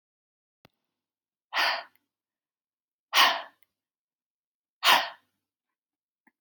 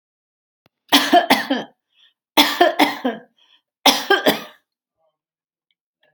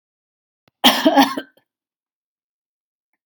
{"exhalation_length": "6.4 s", "exhalation_amplitude": 17670, "exhalation_signal_mean_std_ratio": 0.25, "three_cough_length": "6.1 s", "three_cough_amplitude": 32647, "three_cough_signal_mean_std_ratio": 0.37, "cough_length": "3.3 s", "cough_amplitude": 32767, "cough_signal_mean_std_ratio": 0.28, "survey_phase": "alpha (2021-03-01 to 2021-08-12)", "age": "45-64", "gender": "Female", "wearing_mask": "No", "symptom_none": true, "smoker_status": "Never smoked", "respiratory_condition_asthma": false, "respiratory_condition_other": false, "recruitment_source": "REACT", "submission_delay": "1 day", "covid_test_result": "Negative", "covid_test_method": "RT-qPCR"}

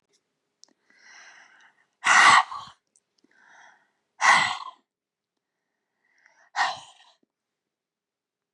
{"exhalation_length": "8.5 s", "exhalation_amplitude": 23621, "exhalation_signal_mean_std_ratio": 0.26, "survey_phase": "beta (2021-08-13 to 2022-03-07)", "age": "65+", "gender": "Female", "wearing_mask": "No", "symptom_cough_any": true, "smoker_status": "Ex-smoker", "respiratory_condition_asthma": false, "respiratory_condition_other": false, "recruitment_source": "REACT", "submission_delay": "2 days", "covid_test_result": "Negative", "covid_test_method": "RT-qPCR", "influenza_a_test_result": "Negative", "influenza_b_test_result": "Negative"}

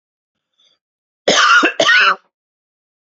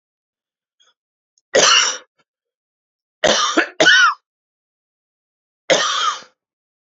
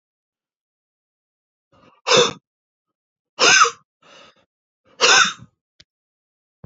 {"cough_length": "3.2 s", "cough_amplitude": 31775, "cough_signal_mean_std_ratio": 0.43, "three_cough_length": "6.9 s", "three_cough_amplitude": 31085, "three_cough_signal_mean_std_ratio": 0.38, "exhalation_length": "6.7 s", "exhalation_amplitude": 30169, "exhalation_signal_mean_std_ratio": 0.28, "survey_phase": "beta (2021-08-13 to 2022-03-07)", "age": "45-64", "gender": "Male", "wearing_mask": "No", "symptom_none": true, "smoker_status": "Never smoked", "respiratory_condition_asthma": true, "respiratory_condition_other": false, "recruitment_source": "REACT", "submission_delay": "3 days", "covid_test_result": "Negative", "covid_test_method": "RT-qPCR"}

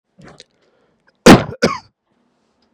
{"cough_length": "2.7 s", "cough_amplitude": 32768, "cough_signal_mean_std_ratio": 0.24, "survey_phase": "beta (2021-08-13 to 2022-03-07)", "age": "18-44", "gender": "Male", "wearing_mask": "No", "symptom_none": true, "smoker_status": "Never smoked", "respiratory_condition_asthma": false, "respiratory_condition_other": false, "recruitment_source": "Test and Trace", "submission_delay": "1 day", "covid_test_result": "Positive", "covid_test_method": "RT-qPCR", "covid_ct_value": 35.4, "covid_ct_gene": "N gene"}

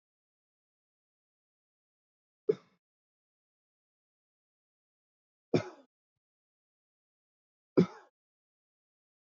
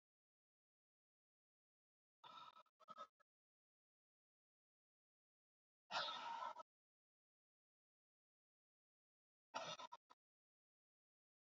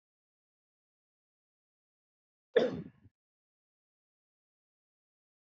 {"three_cough_length": "9.2 s", "three_cough_amplitude": 9947, "three_cough_signal_mean_std_ratio": 0.12, "exhalation_length": "11.4 s", "exhalation_amplitude": 701, "exhalation_signal_mean_std_ratio": 0.26, "cough_length": "5.5 s", "cough_amplitude": 7175, "cough_signal_mean_std_ratio": 0.14, "survey_phase": "alpha (2021-03-01 to 2021-08-12)", "age": "45-64", "gender": "Male", "wearing_mask": "No", "symptom_none": true, "smoker_status": "Ex-smoker", "respiratory_condition_asthma": false, "respiratory_condition_other": false, "recruitment_source": "REACT", "submission_delay": "5 days", "covid_test_result": "Negative", "covid_test_method": "RT-qPCR"}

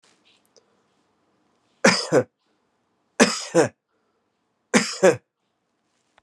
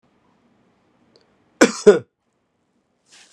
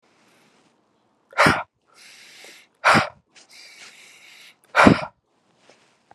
{"three_cough_length": "6.2 s", "three_cough_amplitude": 31278, "three_cough_signal_mean_std_ratio": 0.28, "cough_length": "3.3 s", "cough_amplitude": 32767, "cough_signal_mean_std_ratio": 0.19, "exhalation_length": "6.1 s", "exhalation_amplitude": 32768, "exhalation_signal_mean_std_ratio": 0.27, "survey_phase": "beta (2021-08-13 to 2022-03-07)", "age": "45-64", "gender": "Male", "wearing_mask": "No", "symptom_cough_any": true, "symptom_runny_or_blocked_nose": true, "symptom_sore_throat": true, "symptom_fatigue": true, "symptom_fever_high_temperature": true, "symptom_headache": true, "symptom_change_to_sense_of_smell_or_taste": true, "symptom_other": true, "symptom_onset": "3 days", "smoker_status": "Ex-smoker", "respiratory_condition_asthma": false, "respiratory_condition_other": false, "recruitment_source": "Test and Trace", "submission_delay": "2 days", "covid_test_result": "Positive", "covid_test_method": "RT-qPCR", "covid_ct_value": 20.7, "covid_ct_gene": "ORF1ab gene"}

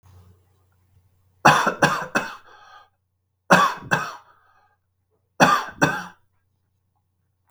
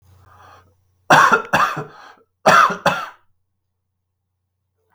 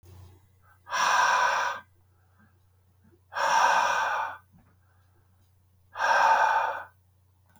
{"three_cough_length": "7.5 s", "three_cough_amplitude": 32766, "three_cough_signal_mean_std_ratio": 0.33, "cough_length": "4.9 s", "cough_amplitude": 32768, "cough_signal_mean_std_ratio": 0.36, "exhalation_length": "7.6 s", "exhalation_amplitude": 11229, "exhalation_signal_mean_std_ratio": 0.52, "survey_phase": "beta (2021-08-13 to 2022-03-07)", "age": "45-64", "gender": "Male", "wearing_mask": "No", "symptom_cough_any": true, "smoker_status": "Ex-smoker", "respiratory_condition_asthma": false, "respiratory_condition_other": false, "recruitment_source": "REACT", "submission_delay": "2 days", "covid_test_result": "Negative", "covid_test_method": "RT-qPCR", "influenza_a_test_result": "Negative", "influenza_b_test_result": "Negative"}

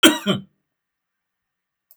{"cough_length": "2.0 s", "cough_amplitude": 32768, "cough_signal_mean_std_ratio": 0.26, "survey_phase": "beta (2021-08-13 to 2022-03-07)", "age": "65+", "gender": "Male", "wearing_mask": "No", "symptom_none": true, "smoker_status": "Ex-smoker", "respiratory_condition_asthma": false, "respiratory_condition_other": false, "recruitment_source": "REACT", "submission_delay": "2 days", "covid_test_result": "Negative", "covid_test_method": "RT-qPCR", "influenza_a_test_result": "Negative", "influenza_b_test_result": "Negative"}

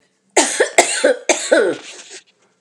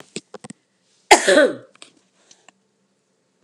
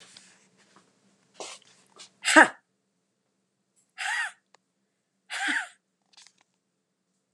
{"three_cough_length": "2.6 s", "three_cough_amplitude": 32768, "three_cough_signal_mean_std_ratio": 0.52, "cough_length": "3.4 s", "cough_amplitude": 32768, "cough_signal_mean_std_ratio": 0.26, "exhalation_length": "7.3 s", "exhalation_amplitude": 31641, "exhalation_signal_mean_std_ratio": 0.21, "survey_phase": "beta (2021-08-13 to 2022-03-07)", "age": "45-64", "gender": "Female", "wearing_mask": "No", "symptom_none": true, "smoker_status": "Ex-smoker", "respiratory_condition_asthma": false, "respiratory_condition_other": false, "recruitment_source": "REACT", "submission_delay": "2 days", "covid_test_result": "Negative", "covid_test_method": "RT-qPCR", "influenza_a_test_result": "Negative", "influenza_b_test_result": "Negative"}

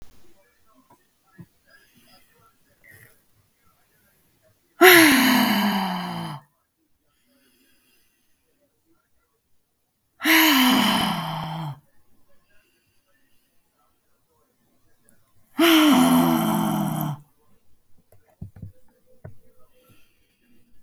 {"exhalation_length": "20.8 s", "exhalation_amplitude": 32768, "exhalation_signal_mean_std_ratio": 0.36, "survey_phase": "beta (2021-08-13 to 2022-03-07)", "age": "45-64", "gender": "Female", "wearing_mask": "No", "symptom_none": true, "smoker_status": "Current smoker (e-cigarettes or vapes only)", "respiratory_condition_asthma": false, "respiratory_condition_other": false, "recruitment_source": "REACT", "submission_delay": "2 days", "covid_test_result": "Negative", "covid_test_method": "RT-qPCR"}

